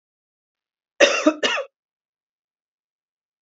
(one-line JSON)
{"cough_length": "3.4 s", "cough_amplitude": 28664, "cough_signal_mean_std_ratio": 0.27, "survey_phase": "beta (2021-08-13 to 2022-03-07)", "age": "45-64", "gender": "Female", "wearing_mask": "No", "symptom_cough_any": true, "symptom_runny_or_blocked_nose": true, "symptom_sore_throat": true, "symptom_fatigue": true, "symptom_headache": true, "symptom_other": true, "smoker_status": "Never smoked", "respiratory_condition_asthma": false, "respiratory_condition_other": false, "recruitment_source": "Test and Trace", "submission_delay": "1 day", "covid_test_result": "Positive", "covid_test_method": "RT-qPCR", "covid_ct_value": 23.4, "covid_ct_gene": "ORF1ab gene"}